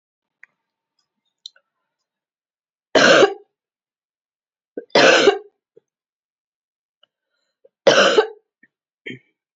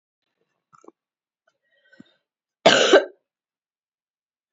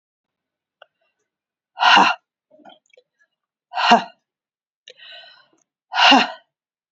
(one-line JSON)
{"three_cough_length": "9.6 s", "three_cough_amplitude": 31179, "three_cough_signal_mean_std_ratio": 0.28, "cough_length": "4.5 s", "cough_amplitude": 27754, "cough_signal_mean_std_ratio": 0.22, "exhalation_length": "6.9 s", "exhalation_amplitude": 29416, "exhalation_signal_mean_std_ratio": 0.29, "survey_phase": "beta (2021-08-13 to 2022-03-07)", "age": "65+", "gender": "Female", "wearing_mask": "No", "symptom_cough_any": true, "symptom_runny_or_blocked_nose": true, "symptom_headache": true, "symptom_other": true, "symptom_onset": "3 days", "smoker_status": "Never smoked", "respiratory_condition_asthma": false, "respiratory_condition_other": false, "recruitment_source": "Test and Trace", "submission_delay": "1 day", "covid_test_result": "Positive", "covid_test_method": "RT-qPCR"}